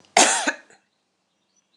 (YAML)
cough_length: 1.8 s
cough_amplitude: 26027
cough_signal_mean_std_ratio: 0.32
survey_phase: alpha (2021-03-01 to 2021-08-12)
age: 45-64
gender: Female
wearing_mask: 'No'
symptom_none: true
smoker_status: Never smoked
respiratory_condition_asthma: false
respiratory_condition_other: false
recruitment_source: REACT
submission_delay: 1 day
covid_test_result: Negative
covid_test_method: RT-qPCR